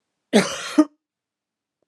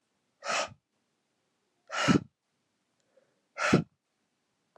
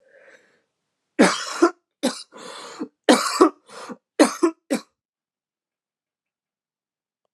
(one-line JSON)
{"cough_length": "1.9 s", "cough_amplitude": 25157, "cough_signal_mean_std_ratio": 0.29, "exhalation_length": "4.8 s", "exhalation_amplitude": 11722, "exhalation_signal_mean_std_ratio": 0.28, "three_cough_length": "7.3 s", "three_cough_amplitude": 32090, "three_cough_signal_mean_std_ratio": 0.3, "survey_phase": "beta (2021-08-13 to 2022-03-07)", "age": "18-44", "gender": "Female", "wearing_mask": "No", "symptom_cough_any": true, "symptom_runny_or_blocked_nose": true, "symptom_shortness_of_breath": true, "symptom_fatigue": true, "symptom_headache": true, "symptom_change_to_sense_of_smell_or_taste": true, "symptom_other": true, "smoker_status": "Never smoked", "respiratory_condition_asthma": false, "respiratory_condition_other": false, "recruitment_source": "Test and Trace", "submission_delay": "2 days", "covid_test_result": "Positive", "covid_test_method": "RT-qPCR", "covid_ct_value": 15.6, "covid_ct_gene": "ORF1ab gene", "covid_ct_mean": 15.9, "covid_viral_load": "6300000 copies/ml", "covid_viral_load_category": "High viral load (>1M copies/ml)"}